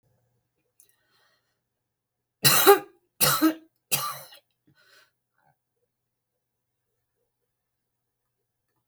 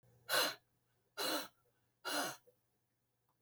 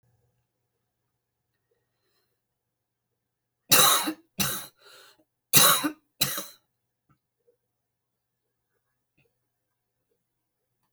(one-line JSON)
{"three_cough_length": "8.9 s", "three_cough_amplitude": 24005, "three_cough_signal_mean_std_ratio": 0.22, "exhalation_length": "3.4 s", "exhalation_amplitude": 2857, "exhalation_signal_mean_std_ratio": 0.4, "cough_length": "10.9 s", "cough_amplitude": 31127, "cough_signal_mean_std_ratio": 0.23, "survey_phase": "beta (2021-08-13 to 2022-03-07)", "age": "65+", "gender": "Female", "wearing_mask": "No", "symptom_cough_any": true, "smoker_status": "Never smoked", "respiratory_condition_asthma": false, "respiratory_condition_other": false, "recruitment_source": "REACT", "submission_delay": "1 day", "covid_test_result": "Negative", "covid_test_method": "RT-qPCR"}